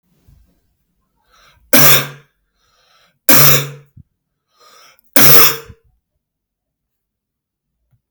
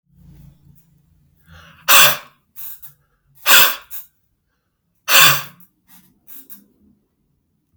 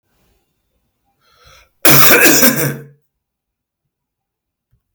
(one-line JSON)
{"three_cough_length": "8.1 s", "three_cough_amplitude": 32768, "three_cough_signal_mean_std_ratio": 0.31, "exhalation_length": "7.8 s", "exhalation_amplitude": 32768, "exhalation_signal_mean_std_ratio": 0.29, "cough_length": "4.9 s", "cough_amplitude": 32768, "cough_signal_mean_std_ratio": 0.35, "survey_phase": "alpha (2021-03-01 to 2021-08-12)", "age": "18-44", "gender": "Male", "wearing_mask": "No", "symptom_cough_any": true, "smoker_status": "Never smoked", "respiratory_condition_asthma": false, "respiratory_condition_other": false, "recruitment_source": "Test and Trace", "submission_delay": "3 days", "covid_test_result": "Positive", "covid_test_method": "RT-qPCR", "covid_ct_value": 17.7, "covid_ct_gene": "ORF1ab gene", "covid_ct_mean": 19.0, "covid_viral_load": "590000 copies/ml", "covid_viral_load_category": "Low viral load (10K-1M copies/ml)"}